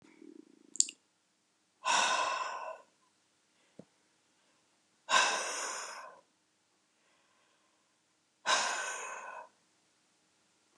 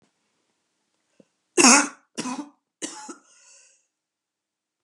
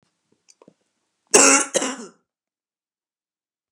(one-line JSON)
{"exhalation_length": "10.8 s", "exhalation_amplitude": 15978, "exhalation_signal_mean_std_ratio": 0.36, "three_cough_length": "4.8 s", "three_cough_amplitude": 32307, "three_cough_signal_mean_std_ratio": 0.23, "cough_length": "3.7 s", "cough_amplitude": 32767, "cough_signal_mean_std_ratio": 0.26, "survey_phase": "beta (2021-08-13 to 2022-03-07)", "age": "45-64", "gender": "Female", "wearing_mask": "No", "symptom_cough_any": true, "symptom_runny_or_blocked_nose": true, "symptom_fatigue": true, "symptom_change_to_sense_of_smell_or_taste": true, "smoker_status": "Never smoked", "respiratory_condition_asthma": false, "respiratory_condition_other": false, "recruitment_source": "REACT", "submission_delay": "2 days", "covid_test_result": "Positive", "covid_test_method": "RT-qPCR", "covid_ct_value": 24.0, "covid_ct_gene": "E gene", "influenza_a_test_result": "Negative", "influenza_b_test_result": "Negative"}